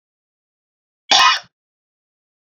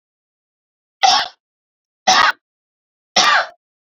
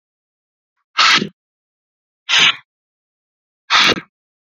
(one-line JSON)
{"cough_length": "2.6 s", "cough_amplitude": 32052, "cough_signal_mean_std_ratio": 0.26, "three_cough_length": "3.8 s", "three_cough_amplitude": 29777, "three_cough_signal_mean_std_ratio": 0.36, "exhalation_length": "4.4 s", "exhalation_amplitude": 31376, "exhalation_signal_mean_std_ratio": 0.34, "survey_phase": "beta (2021-08-13 to 2022-03-07)", "age": "18-44", "gender": "Female", "wearing_mask": "No", "symptom_cough_any": true, "symptom_runny_or_blocked_nose": true, "symptom_sore_throat": true, "symptom_onset": "5 days", "smoker_status": "Never smoked", "respiratory_condition_asthma": false, "respiratory_condition_other": false, "recruitment_source": "REACT", "submission_delay": "3 days", "covid_test_result": "Negative", "covid_test_method": "RT-qPCR"}